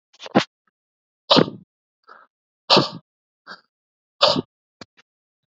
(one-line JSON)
{"exhalation_length": "5.5 s", "exhalation_amplitude": 30651, "exhalation_signal_mean_std_ratio": 0.25, "survey_phase": "beta (2021-08-13 to 2022-03-07)", "age": "45-64", "gender": "Male", "wearing_mask": "No", "symptom_none": true, "smoker_status": "Never smoked", "respiratory_condition_asthma": false, "respiratory_condition_other": false, "recruitment_source": "REACT", "submission_delay": "2 days", "covid_test_result": "Negative", "covid_test_method": "RT-qPCR", "influenza_a_test_result": "Negative", "influenza_b_test_result": "Negative"}